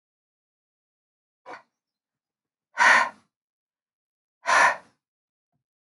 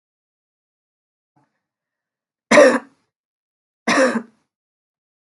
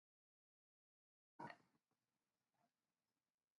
{"exhalation_length": "5.9 s", "exhalation_amplitude": 17384, "exhalation_signal_mean_std_ratio": 0.25, "three_cough_length": "5.3 s", "three_cough_amplitude": 32767, "three_cough_signal_mean_std_ratio": 0.25, "cough_length": "3.6 s", "cough_amplitude": 283, "cough_signal_mean_std_ratio": 0.18, "survey_phase": "beta (2021-08-13 to 2022-03-07)", "age": "65+", "gender": "Female", "wearing_mask": "Yes", "symptom_runny_or_blocked_nose": true, "symptom_sore_throat": true, "smoker_status": "Never smoked", "respiratory_condition_asthma": false, "respiratory_condition_other": false, "recruitment_source": "Test and Trace", "submission_delay": "0 days", "covid_test_result": "Positive", "covid_test_method": "LFT"}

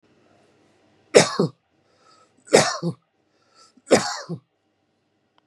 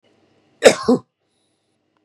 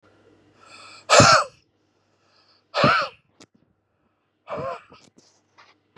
{"three_cough_length": "5.5 s", "three_cough_amplitude": 32768, "three_cough_signal_mean_std_ratio": 0.27, "cough_length": "2.0 s", "cough_amplitude": 32768, "cough_signal_mean_std_ratio": 0.24, "exhalation_length": "6.0 s", "exhalation_amplitude": 32066, "exhalation_signal_mean_std_ratio": 0.28, "survey_phase": "beta (2021-08-13 to 2022-03-07)", "age": "45-64", "gender": "Male", "wearing_mask": "No", "symptom_cough_any": true, "symptom_fatigue": true, "symptom_onset": "3 days", "smoker_status": "Ex-smoker", "respiratory_condition_asthma": false, "respiratory_condition_other": false, "recruitment_source": "Test and Trace", "submission_delay": "2 days", "covid_test_result": "Positive", "covid_test_method": "RT-qPCR", "covid_ct_value": 18.3, "covid_ct_gene": "ORF1ab gene", "covid_ct_mean": 18.7, "covid_viral_load": "710000 copies/ml", "covid_viral_load_category": "Low viral load (10K-1M copies/ml)"}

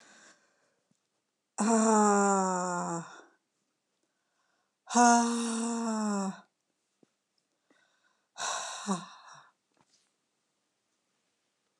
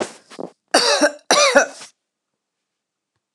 {"exhalation_length": "11.8 s", "exhalation_amplitude": 11817, "exhalation_signal_mean_std_ratio": 0.4, "cough_length": "3.3 s", "cough_amplitude": 29204, "cough_signal_mean_std_ratio": 0.39, "survey_phase": "alpha (2021-03-01 to 2021-08-12)", "age": "65+", "gender": "Female", "wearing_mask": "No", "symptom_none": true, "smoker_status": "Never smoked", "respiratory_condition_asthma": false, "respiratory_condition_other": false, "recruitment_source": "REACT", "submission_delay": "2 days", "covid_test_result": "Negative", "covid_test_method": "RT-qPCR"}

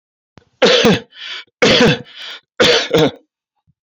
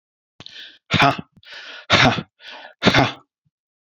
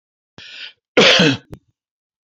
{"three_cough_length": "3.8 s", "three_cough_amplitude": 32102, "three_cough_signal_mean_std_ratio": 0.51, "exhalation_length": "3.8 s", "exhalation_amplitude": 30643, "exhalation_signal_mean_std_ratio": 0.38, "cough_length": "2.3 s", "cough_amplitude": 32196, "cough_signal_mean_std_ratio": 0.36, "survey_phase": "beta (2021-08-13 to 2022-03-07)", "age": "65+", "gender": "Male", "wearing_mask": "No", "symptom_none": true, "smoker_status": "Never smoked", "respiratory_condition_asthma": false, "respiratory_condition_other": false, "recruitment_source": "REACT", "submission_delay": "1 day", "covid_test_result": "Negative", "covid_test_method": "RT-qPCR"}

